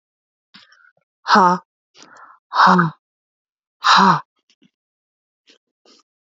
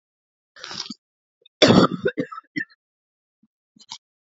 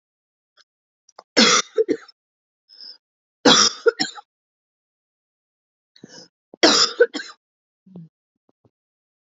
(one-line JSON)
{"exhalation_length": "6.3 s", "exhalation_amplitude": 32767, "exhalation_signal_mean_std_ratio": 0.32, "cough_length": "4.3 s", "cough_amplitude": 29468, "cough_signal_mean_std_ratio": 0.27, "three_cough_length": "9.4 s", "three_cough_amplitude": 31863, "three_cough_signal_mean_std_ratio": 0.28, "survey_phase": "beta (2021-08-13 to 2022-03-07)", "age": "18-44", "gender": "Female", "wearing_mask": "No", "symptom_cough_any": true, "symptom_runny_or_blocked_nose": true, "symptom_shortness_of_breath": true, "symptom_fatigue": true, "symptom_headache": true, "symptom_other": true, "symptom_onset": "4 days", "smoker_status": "Never smoked", "respiratory_condition_asthma": true, "respiratory_condition_other": false, "recruitment_source": "Test and Trace", "submission_delay": "1 day", "covid_test_result": "Positive", "covid_test_method": "RT-qPCR", "covid_ct_value": 25.2, "covid_ct_gene": "ORF1ab gene", "covid_ct_mean": 25.9, "covid_viral_load": "3200 copies/ml", "covid_viral_load_category": "Minimal viral load (< 10K copies/ml)"}